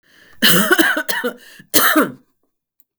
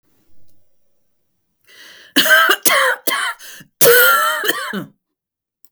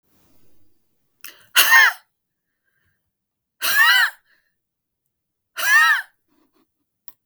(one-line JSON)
{"three_cough_length": "3.0 s", "three_cough_amplitude": 32768, "three_cough_signal_mean_std_ratio": 0.51, "cough_length": "5.7 s", "cough_amplitude": 32768, "cough_signal_mean_std_ratio": 0.48, "exhalation_length": "7.3 s", "exhalation_amplitude": 32768, "exhalation_signal_mean_std_ratio": 0.34, "survey_phase": "beta (2021-08-13 to 2022-03-07)", "age": "65+", "gender": "Female", "wearing_mask": "No", "symptom_fatigue": true, "symptom_headache": true, "smoker_status": "Never smoked", "respiratory_condition_asthma": false, "respiratory_condition_other": false, "recruitment_source": "REACT", "submission_delay": "1 day", "covid_test_result": "Negative", "covid_test_method": "RT-qPCR", "influenza_a_test_result": "Negative", "influenza_b_test_result": "Negative"}